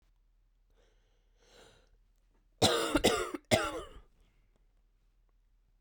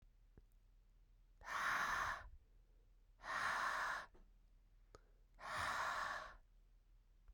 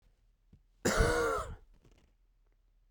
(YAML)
three_cough_length: 5.8 s
three_cough_amplitude: 10714
three_cough_signal_mean_std_ratio: 0.31
exhalation_length: 7.3 s
exhalation_amplitude: 1050
exhalation_signal_mean_std_ratio: 0.57
cough_length: 2.9 s
cough_amplitude: 7041
cough_signal_mean_std_ratio: 0.4
survey_phase: beta (2021-08-13 to 2022-03-07)
age: 18-44
gender: Female
wearing_mask: 'No'
symptom_cough_any: true
symptom_new_continuous_cough: true
symptom_runny_or_blocked_nose: true
symptom_shortness_of_breath: true
symptom_sore_throat: true
symptom_abdominal_pain: true
symptom_fatigue: true
symptom_fever_high_temperature: true
symptom_headache: true
symptom_change_to_sense_of_smell_or_taste: true
symptom_loss_of_taste: true
symptom_onset: 2 days
smoker_status: Ex-smoker
respiratory_condition_asthma: false
respiratory_condition_other: false
recruitment_source: Test and Trace
submission_delay: 1 day
covid_test_result: Positive
covid_test_method: RT-qPCR
covid_ct_value: 12.6
covid_ct_gene: ORF1ab gene
covid_ct_mean: 13.0
covid_viral_load: 55000000 copies/ml
covid_viral_load_category: High viral load (>1M copies/ml)